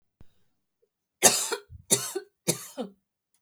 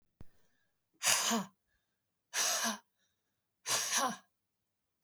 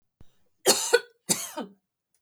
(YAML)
three_cough_length: 3.4 s
three_cough_amplitude: 29108
three_cough_signal_mean_std_ratio: 0.31
exhalation_length: 5.0 s
exhalation_amplitude: 8790
exhalation_signal_mean_std_ratio: 0.43
cough_length: 2.2 s
cough_amplitude: 19820
cough_signal_mean_std_ratio: 0.34
survey_phase: beta (2021-08-13 to 2022-03-07)
age: 45-64
gender: Female
wearing_mask: 'No'
symptom_none: true
smoker_status: Ex-smoker
respiratory_condition_asthma: false
respiratory_condition_other: false
recruitment_source: REACT
submission_delay: 1 day
covid_test_result: Negative
covid_test_method: RT-qPCR
influenza_a_test_result: Negative
influenza_b_test_result: Negative